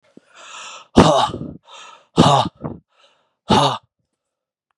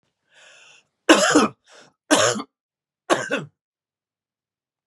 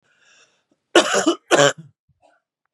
{"exhalation_length": "4.8 s", "exhalation_amplitude": 32768, "exhalation_signal_mean_std_ratio": 0.37, "three_cough_length": "4.9 s", "three_cough_amplitude": 32745, "three_cough_signal_mean_std_ratio": 0.33, "cough_length": "2.7 s", "cough_amplitude": 32767, "cough_signal_mean_std_ratio": 0.35, "survey_phase": "beta (2021-08-13 to 2022-03-07)", "age": "45-64", "gender": "Male", "wearing_mask": "No", "symptom_new_continuous_cough": true, "symptom_runny_or_blocked_nose": true, "symptom_sore_throat": true, "symptom_fatigue": true, "symptom_fever_high_temperature": true, "symptom_headache": true, "symptom_onset": "2 days", "smoker_status": "Never smoked", "respiratory_condition_asthma": false, "respiratory_condition_other": false, "recruitment_source": "Test and Trace", "submission_delay": "2 days", "covid_test_result": "Positive", "covid_test_method": "RT-qPCR", "covid_ct_value": 29.9, "covid_ct_gene": "N gene"}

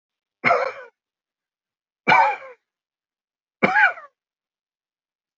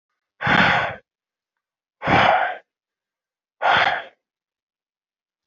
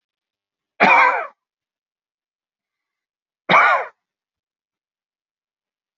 {"three_cough_length": "5.4 s", "three_cough_amplitude": 27164, "three_cough_signal_mean_std_ratio": 0.31, "exhalation_length": "5.5 s", "exhalation_amplitude": 23292, "exhalation_signal_mean_std_ratio": 0.41, "cough_length": "6.0 s", "cough_amplitude": 27797, "cough_signal_mean_std_ratio": 0.28, "survey_phase": "alpha (2021-03-01 to 2021-08-12)", "age": "65+", "gender": "Male", "wearing_mask": "No", "symptom_none": true, "smoker_status": "Never smoked", "respiratory_condition_asthma": false, "respiratory_condition_other": false, "recruitment_source": "REACT", "submission_delay": "1 day", "covid_test_result": "Negative", "covid_test_method": "RT-qPCR"}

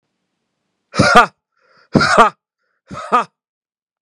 {"exhalation_length": "4.0 s", "exhalation_amplitude": 32768, "exhalation_signal_mean_std_ratio": 0.34, "survey_phase": "beta (2021-08-13 to 2022-03-07)", "age": "18-44", "gender": "Male", "wearing_mask": "No", "symptom_none": true, "smoker_status": "Ex-smoker", "respiratory_condition_asthma": false, "respiratory_condition_other": false, "recruitment_source": "REACT", "submission_delay": "4 days", "covid_test_result": "Negative", "covid_test_method": "RT-qPCR", "influenza_a_test_result": "Negative", "influenza_b_test_result": "Negative"}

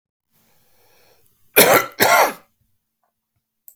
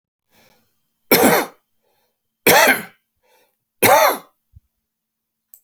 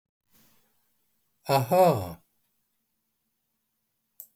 {"cough_length": "3.8 s", "cough_amplitude": 32768, "cough_signal_mean_std_ratio": 0.32, "three_cough_length": "5.6 s", "three_cough_amplitude": 32768, "three_cough_signal_mean_std_ratio": 0.34, "exhalation_length": "4.4 s", "exhalation_amplitude": 11308, "exhalation_signal_mean_std_ratio": 0.28, "survey_phase": "beta (2021-08-13 to 2022-03-07)", "age": "65+", "gender": "Male", "wearing_mask": "No", "symptom_none": true, "smoker_status": "Ex-smoker", "respiratory_condition_asthma": false, "respiratory_condition_other": false, "recruitment_source": "REACT", "submission_delay": "2 days", "covid_test_result": "Negative", "covid_test_method": "RT-qPCR", "influenza_a_test_result": "Negative", "influenza_b_test_result": "Negative"}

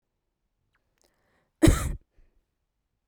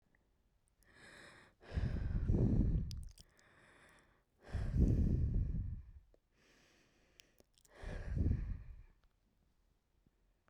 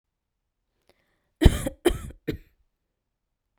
{"cough_length": "3.1 s", "cough_amplitude": 16410, "cough_signal_mean_std_ratio": 0.21, "exhalation_length": "10.5 s", "exhalation_amplitude": 3158, "exhalation_signal_mean_std_ratio": 0.48, "three_cough_length": "3.6 s", "three_cough_amplitude": 30543, "three_cough_signal_mean_std_ratio": 0.21, "survey_phase": "beta (2021-08-13 to 2022-03-07)", "age": "18-44", "gender": "Female", "wearing_mask": "No", "symptom_none": true, "smoker_status": "Never smoked", "respiratory_condition_asthma": true, "respiratory_condition_other": true, "recruitment_source": "REACT", "submission_delay": "1 day", "covid_test_result": "Negative", "covid_test_method": "RT-qPCR"}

